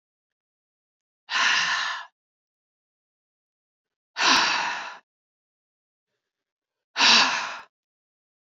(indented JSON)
{
  "exhalation_length": "8.5 s",
  "exhalation_amplitude": 19745,
  "exhalation_signal_mean_std_ratio": 0.36,
  "survey_phase": "beta (2021-08-13 to 2022-03-07)",
  "age": "45-64",
  "gender": "Female",
  "wearing_mask": "No",
  "symptom_cough_any": true,
  "symptom_shortness_of_breath": true,
  "symptom_sore_throat": true,
  "symptom_fatigue": true,
  "symptom_fever_high_temperature": true,
  "symptom_headache": true,
  "symptom_change_to_sense_of_smell_or_taste": true,
  "symptom_loss_of_taste": true,
  "symptom_onset": "4 days",
  "smoker_status": "Ex-smoker",
  "respiratory_condition_asthma": false,
  "respiratory_condition_other": false,
  "recruitment_source": "Test and Trace",
  "submission_delay": "2 days",
  "covid_test_result": "Positive",
  "covid_test_method": "RT-qPCR",
  "covid_ct_value": 25.3,
  "covid_ct_gene": "ORF1ab gene",
  "covid_ct_mean": 25.7,
  "covid_viral_load": "3600 copies/ml",
  "covid_viral_load_category": "Minimal viral load (< 10K copies/ml)"
}